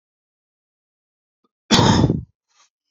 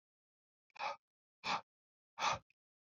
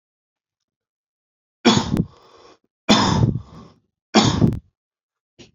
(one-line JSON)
{"cough_length": "2.9 s", "cough_amplitude": 29673, "cough_signal_mean_std_ratio": 0.32, "exhalation_length": "3.0 s", "exhalation_amplitude": 2041, "exhalation_signal_mean_std_ratio": 0.31, "three_cough_length": "5.5 s", "three_cough_amplitude": 27878, "three_cough_signal_mean_std_ratio": 0.37, "survey_phase": "beta (2021-08-13 to 2022-03-07)", "age": "18-44", "gender": "Male", "wearing_mask": "No", "symptom_cough_any": true, "symptom_new_continuous_cough": true, "smoker_status": "Ex-smoker", "respiratory_condition_asthma": false, "respiratory_condition_other": false, "recruitment_source": "Test and Trace", "submission_delay": "-1 day", "covid_test_result": "Negative", "covid_test_method": "LFT"}